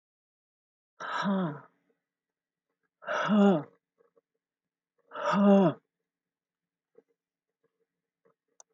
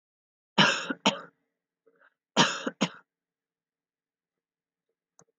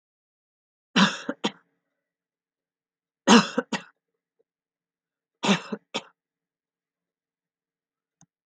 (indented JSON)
{
  "exhalation_length": "8.7 s",
  "exhalation_amplitude": 8612,
  "exhalation_signal_mean_std_ratio": 0.33,
  "cough_length": "5.4 s",
  "cough_amplitude": 16317,
  "cough_signal_mean_std_ratio": 0.26,
  "three_cough_length": "8.5 s",
  "three_cough_amplitude": 26960,
  "three_cough_signal_mean_std_ratio": 0.21,
  "survey_phase": "alpha (2021-03-01 to 2021-08-12)",
  "age": "65+",
  "gender": "Female",
  "wearing_mask": "No",
  "symptom_none": true,
  "smoker_status": "Ex-smoker",
  "respiratory_condition_asthma": false,
  "respiratory_condition_other": false,
  "recruitment_source": "REACT",
  "submission_delay": "1 day",
  "covid_test_result": "Negative",
  "covid_test_method": "RT-qPCR"
}